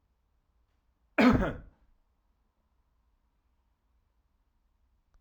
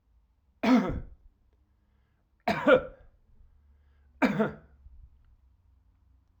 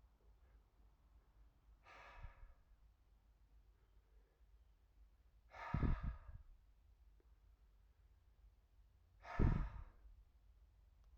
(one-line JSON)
{"cough_length": "5.2 s", "cough_amplitude": 9201, "cough_signal_mean_std_ratio": 0.21, "three_cough_length": "6.4 s", "three_cough_amplitude": 12786, "three_cough_signal_mean_std_ratio": 0.31, "exhalation_length": "11.2 s", "exhalation_amplitude": 2286, "exhalation_signal_mean_std_ratio": 0.29, "survey_phase": "alpha (2021-03-01 to 2021-08-12)", "age": "45-64", "gender": "Male", "wearing_mask": "No", "symptom_none": true, "smoker_status": "Ex-smoker", "respiratory_condition_asthma": false, "respiratory_condition_other": false, "recruitment_source": "REACT", "submission_delay": "1 day", "covid_test_result": "Negative", "covid_test_method": "RT-qPCR"}